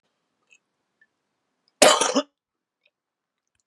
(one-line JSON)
{"cough_length": "3.7 s", "cough_amplitude": 32754, "cough_signal_mean_std_ratio": 0.22, "survey_phase": "beta (2021-08-13 to 2022-03-07)", "age": "45-64", "gender": "Male", "wearing_mask": "No", "symptom_cough_any": true, "symptom_runny_or_blocked_nose": true, "symptom_shortness_of_breath": true, "symptom_change_to_sense_of_smell_or_taste": true, "symptom_onset": "5 days", "smoker_status": "Never smoked", "respiratory_condition_asthma": false, "respiratory_condition_other": false, "recruitment_source": "Test and Trace", "submission_delay": "3 days", "covid_test_result": "Positive", "covid_test_method": "RT-qPCR", "covid_ct_value": 15.1, "covid_ct_gene": "ORF1ab gene", "covid_ct_mean": 15.2, "covid_viral_load": "11000000 copies/ml", "covid_viral_load_category": "High viral load (>1M copies/ml)"}